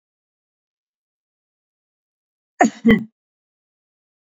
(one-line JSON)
{"cough_length": "4.4 s", "cough_amplitude": 28141, "cough_signal_mean_std_ratio": 0.19, "survey_phase": "beta (2021-08-13 to 2022-03-07)", "age": "45-64", "gender": "Female", "wearing_mask": "No", "symptom_sore_throat": true, "symptom_fatigue": true, "symptom_onset": "13 days", "smoker_status": "Never smoked", "respiratory_condition_asthma": false, "respiratory_condition_other": false, "recruitment_source": "REACT", "submission_delay": "8 days", "covid_test_result": "Negative", "covid_test_method": "RT-qPCR"}